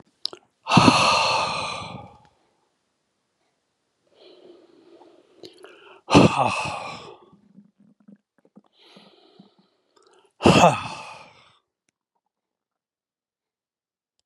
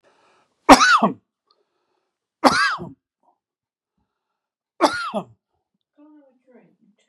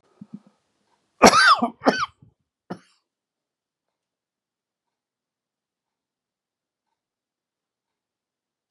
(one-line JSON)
{"exhalation_length": "14.3 s", "exhalation_amplitude": 30936, "exhalation_signal_mean_std_ratio": 0.29, "three_cough_length": "7.1 s", "three_cough_amplitude": 32768, "three_cough_signal_mean_std_ratio": 0.26, "cough_length": "8.7 s", "cough_amplitude": 32768, "cough_signal_mean_std_ratio": 0.19, "survey_phase": "beta (2021-08-13 to 2022-03-07)", "age": "65+", "gender": "Male", "wearing_mask": "No", "symptom_cough_any": true, "symptom_runny_or_blocked_nose": true, "smoker_status": "Ex-smoker", "respiratory_condition_asthma": false, "respiratory_condition_other": false, "recruitment_source": "REACT", "submission_delay": "11 days", "covid_test_result": "Negative", "covid_test_method": "RT-qPCR", "influenza_a_test_result": "Negative", "influenza_b_test_result": "Negative"}